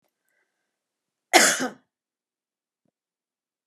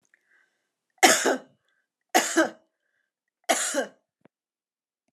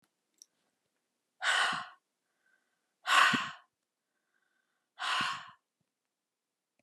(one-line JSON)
{"cough_length": "3.7 s", "cough_amplitude": 28097, "cough_signal_mean_std_ratio": 0.21, "three_cough_length": "5.1 s", "three_cough_amplitude": 28480, "three_cough_signal_mean_std_ratio": 0.31, "exhalation_length": "6.8 s", "exhalation_amplitude": 9577, "exhalation_signal_mean_std_ratio": 0.32, "survey_phase": "alpha (2021-03-01 to 2021-08-12)", "age": "65+", "gender": "Female", "wearing_mask": "No", "symptom_fatigue": true, "smoker_status": "Never smoked", "respiratory_condition_asthma": false, "respiratory_condition_other": false, "recruitment_source": "REACT", "submission_delay": "1 day", "covid_test_result": "Negative", "covid_test_method": "RT-qPCR"}